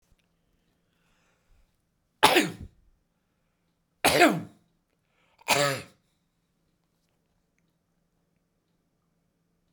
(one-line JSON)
{"three_cough_length": "9.7 s", "three_cough_amplitude": 29848, "three_cough_signal_mean_std_ratio": 0.23, "survey_phase": "beta (2021-08-13 to 2022-03-07)", "age": "45-64", "gender": "Male", "wearing_mask": "No", "symptom_none": true, "smoker_status": "Never smoked", "respiratory_condition_asthma": false, "respiratory_condition_other": true, "recruitment_source": "REACT", "submission_delay": "3 days", "covid_test_result": "Negative", "covid_test_method": "RT-qPCR"}